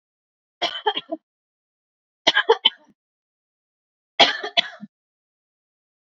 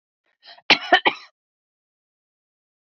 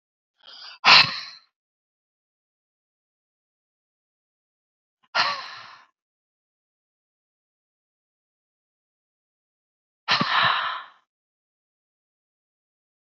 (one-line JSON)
{"three_cough_length": "6.1 s", "three_cough_amplitude": 29904, "three_cough_signal_mean_std_ratio": 0.25, "cough_length": "2.8 s", "cough_amplitude": 30797, "cough_signal_mean_std_ratio": 0.21, "exhalation_length": "13.1 s", "exhalation_amplitude": 30365, "exhalation_signal_mean_std_ratio": 0.22, "survey_phase": "beta (2021-08-13 to 2022-03-07)", "age": "45-64", "gender": "Female", "wearing_mask": "No", "symptom_none": true, "smoker_status": "Never smoked", "respiratory_condition_asthma": true, "respiratory_condition_other": false, "recruitment_source": "REACT", "submission_delay": "0 days", "covid_test_result": "Negative", "covid_test_method": "RT-qPCR", "influenza_a_test_result": "Negative", "influenza_b_test_result": "Negative"}